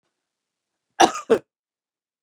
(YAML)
cough_length: 2.2 s
cough_amplitude: 31899
cough_signal_mean_std_ratio: 0.21
survey_phase: beta (2021-08-13 to 2022-03-07)
age: 45-64
gender: Female
wearing_mask: 'No'
symptom_fatigue: true
smoker_status: Ex-smoker
respiratory_condition_asthma: false
respiratory_condition_other: true
recruitment_source: REACT
submission_delay: 2 days
covid_test_result: Negative
covid_test_method: RT-qPCR
influenza_a_test_result: Unknown/Void
influenza_b_test_result: Unknown/Void